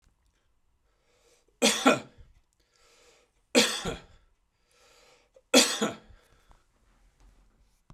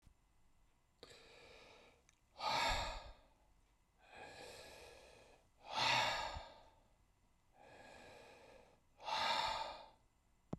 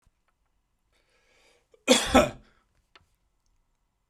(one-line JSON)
{"three_cough_length": "7.9 s", "three_cough_amplitude": 16299, "three_cough_signal_mean_std_ratio": 0.27, "exhalation_length": "10.6 s", "exhalation_amplitude": 2343, "exhalation_signal_mean_std_ratio": 0.43, "cough_length": "4.1 s", "cough_amplitude": 21441, "cough_signal_mean_std_ratio": 0.22, "survey_phase": "beta (2021-08-13 to 2022-03-07)", "age": "45-64", "gender": "Male", "wearing_mask": "No", "symptom_none": true, "smoker_status": "Current smoker (e-cigarettes or vapes only)", "respiratory_condition_asthma": false, "respiratory_condition_other": false, "recruitment_source": "REACT", "submission_delay": "2 days", "covid_test_result": "Negative", "covid_test_method": "RT-qPCR"}